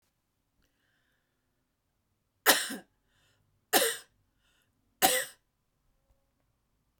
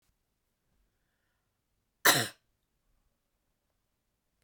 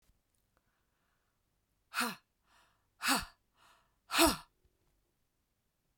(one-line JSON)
{"three_cough_length": "7.0 s", "three_cough_amplitude": 16197, "three_cough_signal_mean_std_ratio": 0.23, "cough_length": "4.4 s", "cough_amplitude": 14222, "cough_signal_mean_std_ratio": 0.16, "exhalation_length": "6.0 s", "exhalation_amplitude": 6794, "exhalation_signal_mean_std_ratio": 0.24, "survey_phase": "beta (2021-08-13 to 2022-03-07)", "age": "45-64", "gender": "Female", "wearing_mask": "No", "symptom_cough_any": true, "symptom_runny_or_blocked_nose": true, "symptom_fatigue": true, "symptom_headache": true, "smoker_status": "Never smoked", "respiratory_condition_asthma": false, "respiratory_condition_other": false, "recruitment_source": "Test and Trace", "submission_delay": "2 days", "covid_test_result": "Positive", "covid_test_method": "RT-qPCR", "covid_ct_value": 27.8, "covid_ct_gene": "ORF1ab gene", "covid_ct_mean": 28.3, "covid_viral_load": "520 copies/ml", "covid_viral_load_category": "Minimal viral load (< 10K copies/ml)"}